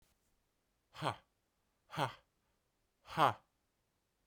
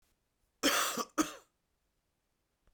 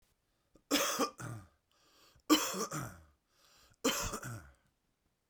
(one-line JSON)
{"exhalation_length": "4.3 s", "exhalation_amplitude": 4979, "exhalation_signal_mean_std_ratio": 0.23, "cough_length": "2.7 s", "cough_amplitude": 6097, "cough_signal_mean_std_ratio": 0.34, "three_cough_length": "5.3 s", "three_cough_amplitude": 7209, "three_cough_signal_mean_std_ratio": 0.4, "survey_phase": "beta (2021-08-13 to 2022-03-07)", "age": "45-64", "gender": "Male", "wearing_mask": "No", "symptom_cough_any": true, "symptom_new_continuous_cough": true, "symptom_runny_or_blocked_nose": true, "symptom_sore_throat": true, "symptom_fatigue": true, "symptom_headache": true, "symptom_onset": "3 days", "smoker_status": "Ex-smoker", "respiratory_condition_asthma": false, "respiratory_condition_other": false, "recruitment_source": "Test and Trace", "submission_delay": "2 days", "covid_test_result": "Positive", "covid_test_method": "RT-qPCR", "covid_ct_value": 20.2, "covid_ct_gene": "N gene", "covid_ct_mean": 20.8, "covid_viral_load": "150000 copies/ml", "covid_viral_load_category": "Low viral load (10K-1M copies/ml)"}